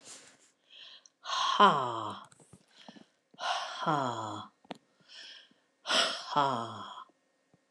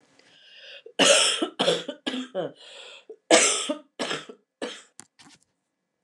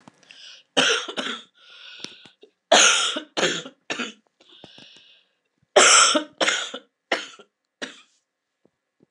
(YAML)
exhalation_length: 7.7 s
exhalation_amplitude: 11948
exhalation_signal_mean_std_ratio: 0.42
cough_length: 6.0 s
cough_amplitude: 26002
cough_signal_mean_std_ratio: 0.41
three_cough_length: 9.1 s
three_cough_amplitude: 28656
three_cough_signal_mean_std_ratio: 0.37
survey_phase: alpha (2021-03-01 to 2021-08-12)
age: 65+
gender: Female
wearing_mask: 'No'
symptom_cough_any: true
symptom_fatigue: true
symptom_onset: 8 days
smoker_status: Ex-smoker
respiratory_condition_asthma: true
respiratory_condition_other: false
recruitment_source: REACT
submission_delay: 31 days
covid_test_result: Negative
covid_test_method: RT-qPCR